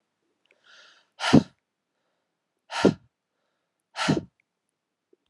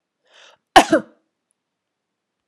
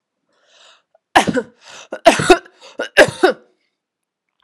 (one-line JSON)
{"exhalation_length": "5.3 s", "exhalation_amplitude": 23147, "exhalation_signal_mean_std_ratio": 0.22, "cough_length": "2.5 s", "cough_amplitude": 32768, "cough_signal_mean_std_ratio": 0.19, "three_cough_length": "4.4 s", "three_cough_amplitude": 32768, "three_cough_signal_mean_std_ratio": 0.31, "survey_phase": "alpha (2021-03-01 to 2021-08-12)", "age": "45-64", "gender": "Female", "wearing_mask": "No", "symptom_cough_any": true, "symptom_abdominal_pain": true, "symptom_diarrhoea": true, "symptom_fatigue": true, "symptom_onset": "6 days", "smoker_status": "Never smoked", "respiratory_condition_asthma": false, "respiratory_condition_other": false, "recruitment_source": "Test and Trace", "submission_delay": "2 days", "covid_test_result": "Positive", "covid_test_method": "RT-qPCR", "covid_ct_value": 15.6, "covid_ct_gene": "N gene", "covid_ct_mean": 15.9, "covid_viral_load": "5900000 copies/ml", "covid_viral_load_category": "High viral load (>1M copies/ml)"}